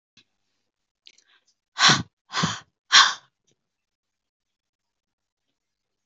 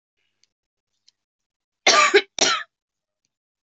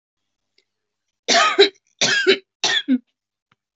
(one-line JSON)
{"exhalation_length": "6.1 s", "exhalation_amplitude": 31005, "exhalation_signal_mean_std_ratio": 0.22, "cough_length": "3.7 s", "cough_amplitude": 30065, "cough_signal_mean_std_ratio": 0.29, "three_cough_length": "3.8 s", "three_cough_amplitude": 29567, "three_cough_signal_mean_std_ratio": 0.41, "survey_phase": "beta (2021-08-13 to 2022-03-07)", "age": "18-44", "gender": "Female", "wearing_mask": "No", "symptom_none": true, "smoker_status": "Never smoked", "respiratory_condition_asthma": false, "respiratory_condition_other": false, "recruitment_source": "REACT", "submission_delay": "1 day", "covid_test_result": "Negative", "covid_test_method": "RT-qPCR", "influenza_a_test_result": "Negative", "influenza_b_test_result": "Negative"}